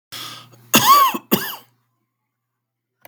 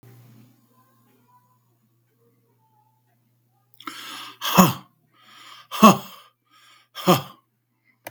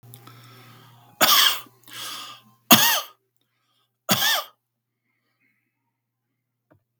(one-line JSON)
{"cough_length": "3.1 s", "cough_amplitude": 32768, "cough_signal_mean_std_ratio": 0.36, "exhalation_length": "8.1 s", "exhalation_amplitude": 32766, "exhalation_signal_mean_std_ratio": 0.22, "three_cough_length": "7.0 s", "three_cough_amplitude": 32768, "three_cough_signal_mean_std_ratio": 0.31, "survey_phase": "beta (2021-08-13 to 2022-03-07)", "age": "45-64", "gender": "Male", "wearing_mask": "No", "symptom_none": true, "smoker_status": "Never smoked", "respiratory_condition_asthma": false, "respiratory_condition_other": false, "recruitment_source": "REACT", "submission_delay": "3 days", "covid_test_result": "Negative", "covid_test_method": "RT-qPCR", "influenza_a_test_result": "Negative", "influenza_b_test_result": "Negative"}